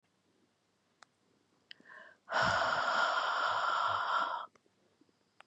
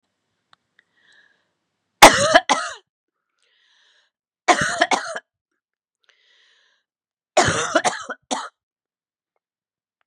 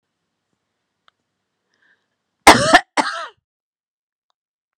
exhalation_length: 5.5 s
exhalation_amplitude: 3629
exhalation_signal_mean_std_ratio: 0.57
three_cough_length: 10.1 s
three_cough_amplitude: 32768
three_cough_signal_mean_std_ratio: 0.26
cough_length: 4.8 s
cough_amplitude: 32768
cough_signal_mean_std_ratio: 0.21
survey_phase: beta (2021-08-13 to 2022-03-07)
age: 45-64
gender: Female
wearing_mask: 'No'
symptom_cough_any: true
symptom_runny_or_blocked_nose: true
smoker_status: Never smoked
respiratory_condition_asthma: false
respiratory_condition_other: false
recruitment_source: Test and Trace
submission_delay: 3 days
covid_test_method: RT-qPCR
covid_ct_value: 35.9
covid_ct_gene: ORF1ab gene
covid_ct_mean: 35.9
covid_viral_load: 1.6 copies/ml
covid_viral_load_category: Minimal viral load (< 10K copies/ml)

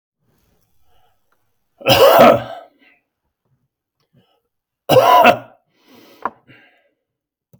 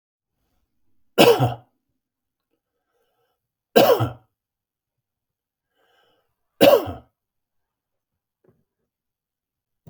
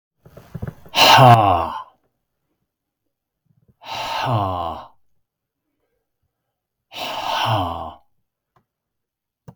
cough_length: 7.6 s
cough_amplitude: 32768
cough_signal_mean_std_ratio: 0.31
three_cough_length: 9.9 s
three_cough_amplitude: 32766
three_cough_signal_mean_std_ratio: 0.23
exhalation_length: 9.6 s
exhalation_amplitude: 32768
exhalation_signal_mean_std_ratio: 0.34
survey_phase: beta (2021-08-13 to 2022-03-07)
age: 65+
gender: Male
wearing_mask: 'No'
symptom_none: true
smoker_status: Never smoked
respiratory_condition_asthma: false
respiratory_condition_other: false
recruitment_source: REACT
submission_delay: 2 days
covid_test_result: Negative
covid_test_method: RT-qPCR
influenza_a_test_result: Negative
influenza_b_test_result: Negative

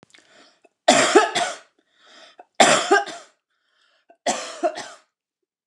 three_cough_length: 5.7 s
three_cough_amplitude: 29203
three_cough_signal_mean_std_ratio: 0.37
survey_phase: beta (2021-08-13 to 2022-03-07)
age: 45-64
gender: Female
wearing_mask: 'No'
symptom_none: true
smoker_status: Never smoked
respiratory_condition_asthma: false
respiratory_condition_other: false
recruitment_source: REACT
submission_delay: 1 day
covid_test_result: Negative
covid_test_method: RT-qPCR
influenza_a_test_result: Negative
influenza_b_test_result: Negative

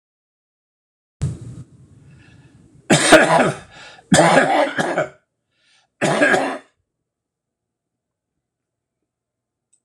three_cough_length: 9.8 s
three_cough_amplitude: 26028
three_cough_signal_mean_std_ratio: 0.37
survey_phase: alpha (2021-03-01 to 2021-08-12)
age: 65+
gender: Male
wearing_mask: 'No'
symptom_none: true
smoker_status: Never smoked
respiratory_condition_asthma: false
respiratory_condition_other: false
recruitment_source: REACT
submission_delay: 2 days
covid_test_result: Negative
covid_test_method: RT-qPCR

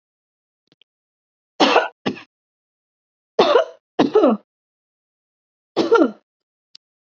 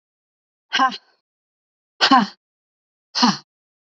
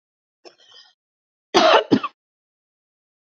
three_cough_length: 7.2 s
three_cough_amplitude: 29290
three_cough_signal_mean_std_ratio: 0.32
exhalation_length: 3.9 s
exhalation_amplitude: 32047
exhalation_signal_mean_std_ratio: 0.3
cough_length: 3.3 s
cough_amplitude: 32768
cough_signal_mean_std_ratio: 0.28
survey_phase: alpha (2021-03-01 to 2021-08-12)
age: 45-64
gender: Female
wearing_mask: 'No'
symptom_none: true
smoker_status: Never smoked
respiratory_condition_asthma: true
respiratory_condition_other: false
recruitment_source: REACT
submission_delay: 1 day
covid_test_result: Negative
covid_test_method: RT-qPCR
covid_ct_value: 44.0
covid_ct_gene: N gene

